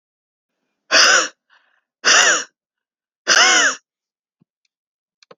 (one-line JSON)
{"exhalation_length": "5.4 s", "exhalation_amplitude": 32768, "exhalation_signal_mean_std_ratio": 0.39, "survey_phase": "beta (2021-08-13 to 2022-03-07)", "age": "45-64", "gender": "Female", "wearing_mask": "No", "symptom_none": true, "smoker_status": "Never smoked", "respiratory_condition_asthma": false, "respiratory_condition_other": false, "recruitment_source": "REACT", "submission_delay": "2 days", "covid_test_result": "Negative", "covid_test_method": "RT-qPCR"}